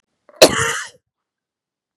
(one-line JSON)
{"cough_length": "2.0 s", "cough_amplitude": 32768, "cough_signal_mean_std_ratio": 0.27, "survey_phase": "beta (2021-08-13 to 2022-03-07)", "age": "45-64", "gender": "Male", "wearing_mask": "No", "symptom_cough_any": true, "symptom_runny_or_blocked_nose": true, "symptom_sore_throat": true, "symptom_fatigue": true, "symptom_headache": true, "smoker_status": "Never smoked", "respiratory_condition_asthma": false, "respiratory_condition_other": false, "recruitment_source": "Test and Trace", "submission_delay": "0 days", "covid_test_result": "Negative", "covid_test_method": "RT-qPCR"}